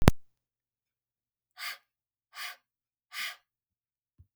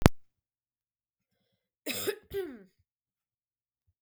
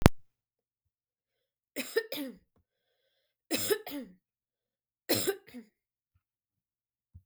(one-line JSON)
{"exhalation_length": "4.4 s", "exhalation_amplitude": 32768, "exhalation_signal_mean_std_ratio": 0.2, "cough_length": "4.0 s", "cough_amplitude": 32768, "cough_signal_mean_std_ratio": 0.21, "three_cough_length": "7.3 s", "three_cough_amplitude": 32768, "three_cough_signal_mean_std_ratio": 0.25, "survey_phase": "beta (2021-08-13 to 2022-03-07)", "age": "18-44", "gender": "Female", "wearing_mask": "No", "symptom_runny_or_blocked_nose": true, "smoker_status": "Never smoked", "respiratory_condition_asthma": false, "respiratory_condition_other": false, "recruitment_source": "REACT", "submission_delay": "2 days", "covid_test_result": "Negative", "covid_test_method": "RT-qPCR", "influenza_a_test_result": "Negative", "influenza_b_test_result": "Negative"}